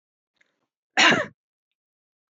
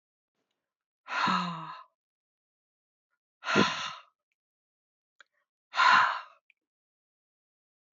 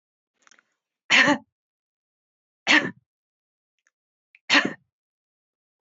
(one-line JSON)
{"cough_length": "2.3 s", "cough_amplitude": 18907, "cough_signal_mean_std_ratio": 0.27, "exhalation_length": "7.9 s", "exhalation_amplitude": 13180, "exhalation_signal_mean_std_ratio": 0.31, "three_cough_length": "5.8 s", "three_cough_amplitude": 19224, "three_cough_signal_mean_std_ratio": 0.25, "survey_phase": "beta (2021-08-13 to 2022-03-07)", "age": "65+", "gender": "Female", "wearing_mask": "No", "symptom_none": true, "symptom_onset": "3 days", "smoker_status": "Never smoked", "respiratory_condition_asthma": false, "respiratory_condition_other": false, "recruitment_source": "REACT", "submission_delay": "1 day", "covid_test_result": "Negative", "covid_test_method": "RT-qPCR"}